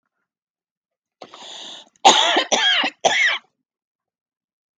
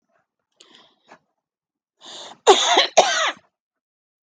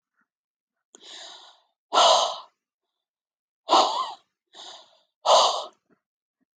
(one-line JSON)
{"three_cough_length": "4.8 s", "three_cough_amplitude": 32768, "three_cough_signal_mean_std_ratio": 0.39, "cough_length": "4.4 s", "cough_amplitude": 32768, "cough_signal_mean_std_ratio": 0.31, "exhalation_length": "6.6 s", "exhalation_amplitude": 17258, "exhalation_signal_mean_std_ratio": 0.33, "survey_phase": "beta (2021-08-13 to 2022-03-07)", "age": "45-64", "gender": "Female", "wearing_mask": "No", "symptom_cough_any": true, "smoker_status": "Ex-smoker", "respiratory_condition_asthma": false, "respiratory_condition_other": false, "recruitment_source": "REACT", "submission_delay": "-1 day", "covid_test_result": "Negative", "covid_test_method": "RT-qPCR"}